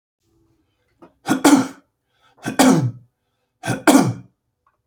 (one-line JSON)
{"three_cough_length": "4.9 s", "three_cough_amplitude": 31854, "three_cough_signal_mean_std_ratio": 0.37, "survey_phase": "beta (2021-08-13 to 2022-03-07)", "age": "65+", "gender": "Male", "wearing_mask": "No", "symptom_none": true, "smoker_status": "Never smoked", "respiratory_condition_asthma": true, "respiratory_condition_other": false, "recruitment_source": "REACT", "submission_delay": "2 days", "covid_test_result": "Negative", "covid_test_method": "RT-qPCR", "influenza_a_test_result": "Negative", "influenza_b_test_result": "Negative"}